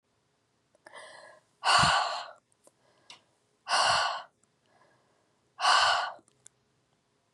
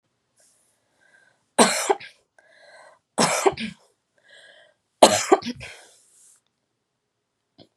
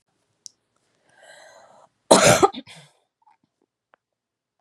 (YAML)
exhalation_length: 7.3 s
exhalation_amplitude: 10378
exhalation_signal_mean_std_ratio: 0.38
three_cough_length: 7.8 s
three_cough_amplitude: 32768
three_cough_signal_mean_std_ratio: 0.26
cough_length: 4.6 s
cough_amplitude: 32767
cough_signal_mean_std_ratio: 0.22
survey_phase: beta (2021-08-13 to 2022-03-07)
age: 18-44
gender: Female
wearing_mask: 'No'
symptom_runny_or_blocked_nose: true
symptom_fatigue: true
smoker_status: Never smoked
respiratory_condition_asthma: false
respiratory_condition_other: false
recruitment_source: REACT
submission_delay: 1 day
covid_test_result: Negative
covid_test_method: RT-qPCR
influenza_a_test_result: Negative
influenza_b_test_result: Negative